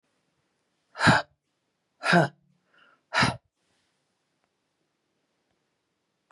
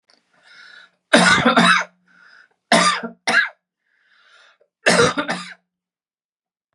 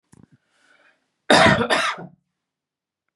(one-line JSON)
{"exhalation_length": "6.3 s", "exhalation_amplitude": 18332, "exhalation_signal_mean_std_ratio": 0.24, "three_cough_length": "6.7 s", "three_cough_amplitude": 32687, "three_cough_signal_mean_std_ratio": 0.4, "cough_length": "3.2 s", "cough_amplitude": 30213, "cough_signal_mean_std_ratio": 0.34, "survey_phase": "beta (2021-08-13 to 2022-03-07)", "age": "45-64", "gender": "Female", "wearing_mask": "No", "symptom_cough_any": true, "smoker_status": "Never smoked", "respiratory_condition_asthma": false, "respiratory_condition_other": false, "recruitment_source": "REACT", "submission_delay": "1 day", "covid_test_result": "Negative", "covid_test_method": "RT-qPCR", "influenza_a_test_result": "Negative", "influenza_b_test_result": "Negative"}